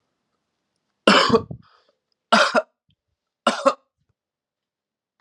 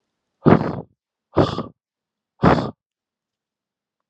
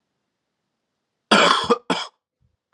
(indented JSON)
{
  "three_cough_length": "5.2 s",
  "three_cough_amplitude": 32767,
  "three_cough_signal_mean_std_ratio": 0.3,
  "exhalation_length": "4.1 s",
  "exhalation_amplitude": 32684,
  "exhalation_signal_mean_std_ratio": 0.3,
  "cough_length": "2.7 s",
  "cough_amplitude": 31143,
  "cough_signal_mean_std_ratio": 0.34,
  "survey_phase": "alpha (2021-03-01 to 2021-08-12)",
  "age": "18-44",
  "gender": "Male",
  "wearing_mask": "No",
  "symptom_cough_any": true,
  "symptom_fatigue": true,
  "symptom_fever_high_temperature": true,
  "symptom_headache": true,
  "symptom_onset": "4 days",
  "smoker_status": "Ex-smoker",
  "respiratory_condition_asthma": false,
  "respiratory_condition_other": false,
  "recruitment_source": "Test and Trace",
  "submission_delay": "2 days",
  "covid_test_result": "Positive",
  "covid_test_method": "RT-qPCR",
  "covid_ct_value": 11.2,
  "covid_ct_gene": "N gene",
  "covid_ct_mean": 11.4,
  "covid_viral_load": "180000000 copies/ml",
  "covid_viral_load_category": "High viral load (>1M copies/ml)"
}